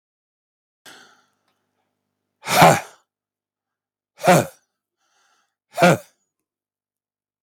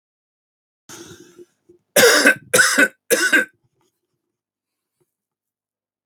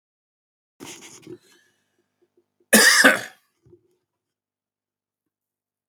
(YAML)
exhalation_length: 7.4 s
exhalation_amplitude: 32768
exhalation_signal_mean_std_ratio: 0.24
three_cough_length: 6.1 s
three_cough_amplitude: 32677
three_cough_signal_mean_std_ratio: 0.33
cough_length: 5.9 s
cough_amplitude: 32768
cough_signal_mean_std_ratio: 0.23
survey_phase: beta (2021-08-13 to 2022-03-07)
age: 18-44
gender: Male
wearing_mask: 'No'
symptom_cough_any: true
symptom_runny_or_blocked_nose: true
symptom_fatigue: true
symptom_headache: true
symptom_other: true
smoker_status: Never smoked
respiratory_condition_asthma: false
respiratory_condition_other: false
recruitment_source: Test and Trace
submission_delay: -1 day
covid_test_result: Positive
covid_test_method: LFT